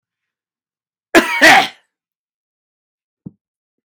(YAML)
cough_length: 3.9 s
cough_amplitude: 32767
cough_signal_mean_std_ratio: 0.27
survey_phase: beta (2021-08-13 to 2022-03-07)
age: 65+
gender: Male
wearing_mask: 'No'
symptom_none: true
smoker_status: Ex-smoker
respiratory_condition_asthma: false
respiratory_condition_other: false
recruitment_source: REACT
submission_delay: 2 days
covid_test_result: Negative
covid_test_method: RT-qPCR
influenza_a_test_result: Negative
influenza_b_test_result: Negative